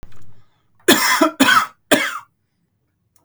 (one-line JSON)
{"three_cough_length": "3.2 s", "three_cough_amplitude": 32768, "three_cough_signal_mean_std_ratio": 0.46, "survey_phase": "beta (2021-08-13 to 2022-03-07)", "age": "18-44", "gender": "Male", "wearing_mask": "No", "symptom_none": true, "smoker_status": "Never smoked", "respiratory_condition_asthma": false, "respiratory_condition_other": false, "recruitment_source": "REACT", "submission_delay": "1 day", "covid_test_result": "Negative", "covid_test_method": "RT-qPCR", "influenza_a_test_result": "Negative", "influenza_b_test_result": "Negative"}